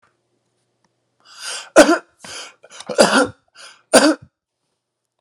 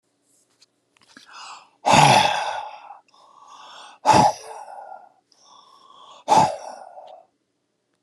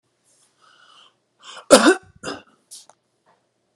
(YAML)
three_cough_length: 5.2 s
three_cough_amplitude: 32768
three_cough_signal_mean_std_ratio: 0.31
exhalation_length: 8.0 s
exhalation_amplitude: 30570
exhalation_signal_mean_std_ratio: 0.35
cough_length: 3.8 s
cough_amplitude: 32768
cough_signal_mean_std_ratio: 0.22
survey_phase: beta (2021-08-13 to 2022-03-07)
age: 45-64
gender: Male
wearing_mask: 'No'
symptom_none: true
smoker_status: Never smoked
respiratory_condition_asthma: false
respiratory_condition_other: false
recruitment_source: REACT
submission_delay: 2 days
covid_test_result: Negative
covid_test_method: RT-qPCR